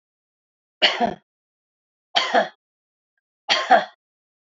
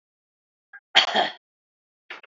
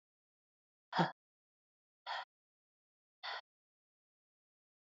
{
  "three_cough_length": "4.5 s",
  "three_cough_amplitude": 27690,
  "three_cough_signal_mean_std_ratio": 0.32,
  "cough_length": "2.3 s",
  "cough_amplitude": 28362,
  "cough_signal_mean_std_ratio": 0.27,
  "exhalation_length": "4.9 s",
  "exhalation_amplitude": 4292,
  "exhalation_signal_mean_std_ratio": 0.2,
  "survey_phase": "beta (2021-08-13 to 2022-03-07)",
  "age": "45-64",
  "gender": "Female",
  "wearing_mask": "No",
  "symptom_runny_or_blocked_nose": true,
  "symptom_fatigue": true,
  "symptom_change_to_sense_of_smell_or_taste": true,
  "symptom_other": true,
  "symptom_onset": "5 days",
  "smoker_status": "Never smoked",
  "respiratory_condition_asthma": false,
  "respiratory_condition_other": false,
  "recruitment_source": "Test and Trace",
  "submission_delay": "2 days",
  "covid_test_result": "Positive",
  "covid_test_method": "ePCR"
}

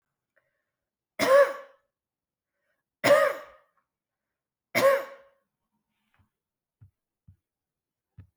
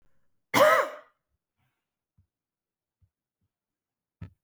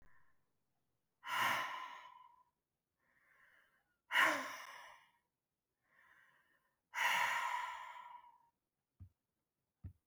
{
  "three_cough_length": "8.4 s",
  "three_cough_amplitude": 12782,
  "three_cough_signal_mean_std_ratio": 0.26,
  "cough_length": "4.4 s",
  "cough_amplitude": 17097,
  "cough_signal_mean_std_ratio": 0.22,
  "exhalation_length": "10.1 s",
  "exhalation_amplitude": 3892,
  "exhalation_signal_mean_std_ratio": 0.37,
  "survey_phase": "beta (2021-08-13 to 2022-03-07)",
  "age": "45-64",
  "gender": "Female",
  "wearing_mask": "No",
  "symptom_none": true,
  "smoker_status": "Never smoked",
  "respiratory_condition_asthma": false,
  "respiratory_condition_other": false,
  "recruitment_source": "REACT",
  "submission_delay": "1 day",
  "covid_test_result": "Negative",
  "covid_test_method": "RT-qPCR"
}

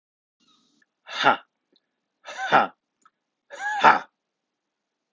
{
  "exhalation_length": "5.1 s",
  "exhalation_amplitude": 29575,
  "exhalation_signal_mean_std_ratio": 0.27,
  "survey_phase": "alpha (2021-03-01 to 2021-08-12)",
  "age": "18-44",
  "gender": "Male",
  "wearing_mask": "No",
  "symptom_none": true,
  "symptom_onset": "4 days",
  "smoker_status": "Ex-smoker",
  "respiratory_condition_asthma": false,
  "respiratory_condition_other": false,
  "recruitment_source": "Test and Trace",
  "submission_delay": "1 day",
  "covid_test_result": "Positive",
  "covid_test_method": "RT-qPCR"
}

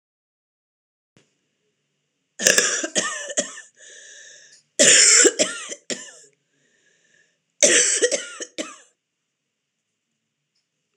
{
  "cough_length": "11.0 s",
  "cough_amplitude": 26028,
  "cough_signal_mean_std_ratio": 0.34,
  "survey_phase": "alpha (2021-03-01 to 2021-08-12)",
  "age": "45-64",
  "gender": "Female",
  "wearing_mask": "No",
  "symptom_cough_any": true,
  "symptom_fatigue": true,
  "symptom_headache": true,
  "symptom_onset": "12 days",
  "smoker_status": "Never smoked",
  "respiratory_condition_asthma": false,
  "respiratory_condition_other": true,
  "recruitment_source": "REACT",
  "submission_delay": "2 days",
  "covid_test_result": "Negative",
  "covid_test_method": "RT-qPCR"
}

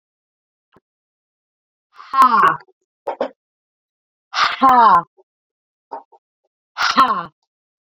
{
  "exhalation_length": "7.9 s",
  "exhalation_amplitude": 30066,
  "exhalation_signal_mean_std_ratio": 0.35,
  "survey_phase": "beta (2021-08-13 to 2022-03-07)",
  "age": "18-44",
  "gender": "Female",
  "wearing_mask": "No",
  "symptom_cough_any": true,
  "symptom_new_continuous_cough": true,
  "symptom_runny_or_blocked_nose": true,
  "symptom_shortness_of_breath": true,
  "symptom_sore_throat": true,
  "symptom_fatigue": true,
  "symptom_fever_high_temperature": true,
  "symptom_headache": true,
  "symptom_change_to_sense_of_smell_or_taste": true,
  "symptom_loss_of_taste": true,
  "smoker_status": "Ex-smoker",
  "respiratory_condition_asthma": false,
  "respiratory_condition_other": false,
  "recruitment_source": "Test and Trace",
  "submission_delay": "1 day",
  "covid_test_result": "Positive",
  "covid_test_method": "RT-qPCR",
  "covid_ct_value": 15.0,
  "covid_ct_gene": "ORF1ab gene",
  "covid_ct_mean": 15.2,
  "covid_viral_load": "10000000 copies/ml",
  "covid_viral_load_category": "High viral load (>1M copies/ml)"
}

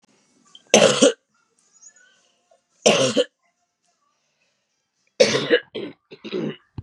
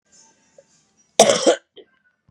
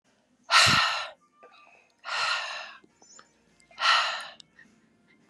{
  "three_cough_length": "6.8 s",
  "three_cough_amplitude": 32767,
  "three_cough_signal_mean_std_ratio": 0.33,
  "cough_length": "2.3 s",
  "cough_amplitude": 32768,
  "cough_signal_mean_std_ratio": 0.28,
  "exhalation_length": "5.3 s",
  "exhalation_amplitude": 16348,
  "exhalation_signal_mean_std_ratio": 0.41,
  "survey_phase": "beta (2021-08-13 to 2022-03-07)",
  "age": "18-44",
  "gender": "Female",
  "wearing_mask": "No",
  "symptom_cough_any": true,
  "symptom_runny_or_blocked_nose": true,
  "symptom_sore_throat": true,
  "symptom_fatigue": true,
  "symptom_headache": true,
  "symptom_loss_of_taste": true,
  "symptom_other": true,
  "symptom_onset": "6 days",
  "smoker_status": "Ex-smoker",
  "respiratory_condition_asthma": false,
  "respiratory_condition_other": false,
  "recruitment_source": "Test and Trace",
  "submission_delay": "2 days",
  "covid_test_result": "Positive",
  "covid_test_method": "RT-qPCR",
  "covid_ct_value": 19.8,
  "covid_ct_gene": "ORF1ab gene",
  "covid_ct_mean": 20.4,
  "covid_viral_load": "200000 copies/ml",
  "covid_viral_load_category": "Low viral load (10K-1M copies/ml)"
}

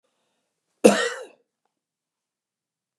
{
  "cough_length": "3.0 s",
  "cough_amplitude": 32719,
  "cough_signal_mean_std_ratio": 0.2,
  "survey_phase": "beta (2021-08-13 to 2022-03-07)",
  "age": "65+",
  "gender": "Male",
  "wearing_mask": "No",
  "symptom_none": true,
  "smoker_status": "Ex-smoker",
  "respiratory_condition_asthma": false,
  "respiratory_condition_other": false,
  "recruitment_source": "REACT",
  "submission_delay": "1 day",
  "covid_test_result": "Negative",
  "covid_test_method": "RT-qPCR",
  "influenza_a_test_result": "Negative",
  "influenza_b_test_result": "Negative"
}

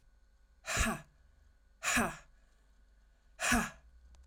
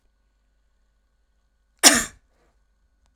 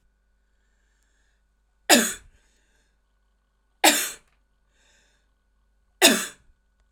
{
  "exhalation_length": "4.3 s",
  "exhalation_amplitude": 5114,
  "exhalation_signal_mean_std_ratio": 0.4,
  "cough_length": "3.2 s",
  "cough_amplitude": 32768,
  "cough_signal_mean_std_ratio": 0.18,
  "three_cough_length": "6.9 s",
  "three_cough_amplitude": 32767,
  "three_cough_signal_mean_std_ratio": 0.23,
  "survey_phase": "alpha (2021-03-01 to 2021-08-12)",
  "age": "45-64",
  "gender": "Female",
  "wearing_mask": "No",
  "symptom_cough_any": true,
  "symptom_fatigue": true,
  "symptom_headache": true,
  "symptom_onset": "9 days",
  "smoker_status": "Never smoked",
  "respiratory_condition_asthma": true,
  "respiratory_condition_other": false,
  "recruitment_source": "Test and Trace",
  "submission_delay": "1 day",
  "covid_test_result": "Positive",
  "covid_test_method": "RT-qPCR"
}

